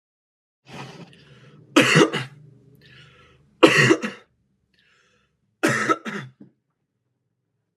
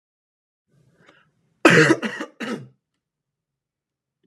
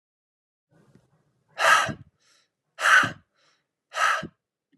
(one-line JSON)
{"three_cough_length": "7.8 s", "three_cough_amplitude": 32768, "three_cough_signal_mean_std_ratio": 0.31, "cough_length": "4.3 s", "cough_amplitude": 32767, "cough_signal_mean_std_ratio": 0.26, "exhalation_length": "4.8 s", "exhalation_amplitude": 16641, "exhalation_signal_mean_std_ratio": 0.33, "survey_phase": "alpha (2021-03-01 to 2021-08-12)", "age": "18-44", "gender": "Male", "wearing_mask": "No", "symptom_change_to_sense_of_smell_or_taste": true, "symptom_onset": "2 days", "smoker_status": "Never smoked", "respiratory_condition_asthma": false, "respiratory_condition_other": false, "recruitment_source": "Test and Trace", "submission_delay": "1 day", "covid_test_result": "Positive", "covid_test_method": "RT-qPCR", "covid_ct_value": 20.4, "covid_ct_gene": "ORF1ab gene"}